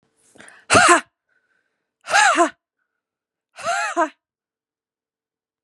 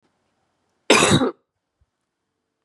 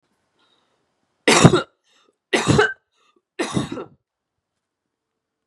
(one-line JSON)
{"exhalation_length": "5.6 s", "exhalation_amplitude": 32293, "exhalation_signal_mean_std_ratio": 0.33, "cough_length": "2.6 s", "cough_amplitude": 31954, "cough_signal_mean_std_ratio": 0.31, "three_cough_length": "5.5 s", "three_cough_amplitude": 32768, "three_cough_signal_mean_std_ratio": 0.3, "survey_phase": "beta (2021-08-13 to 2022-03-07)", "age": "18-44", "gender": "Female", "wearing_mask": "No", "symptom_none": true, "smoker_status": "Current smoker (e-cigarettes or vapes only)", "respiratory_condition_asthma": false, "respiratory_condition_other": false, "recruitment_source": "REACT", "submission_delay": "2 days", "covid_test_result": "Negative", "covid_test_method": "RT-qPCR", "influenza_a_test_result": "Negative", "influenza_b_test_result": "Negative"}